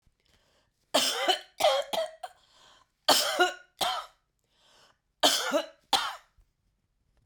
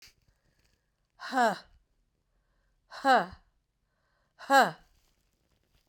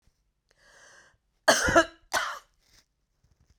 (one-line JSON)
{"three_cough_length": "7.3 s", "three_cough_amplitude": 17412, "three_cough_signal_mean_std_ratio": 0.42, "exhalation_length": "5.9 s", "exhalation_amplitude": 12464, "exhalation_signal_mean_std_ratio": 0.26, "cough_length": "3.6 s", "cough_amplitude": 16770, "cough_signal_mean_std_ratio": 0.29, "survey_phase": "beta (2021-08-13 to 2022-03-07)", "age": "45-64", "gender": "Female", "wearing_mask": "No", "symptom_cough_any": true, "symptom_other": true, "smoker_status": "Never smoked", "respiratory_condition_asthma": false, "respiratory_condition_other": false, "recruitment_source": "Test and Trace", "submission_delay": "2 days", "covid_test_result": "Positive", "covid_test_method": "RT-qPCR", "covid_ct_value": 15.0, "covid_ct_gene": "ORF1ab gene", "covid_ct_mean": 15.3, "covid_viral_load": "9800000 copies/ml", "covid_viral_load_category": "High viral load (>1M copies/ml)"}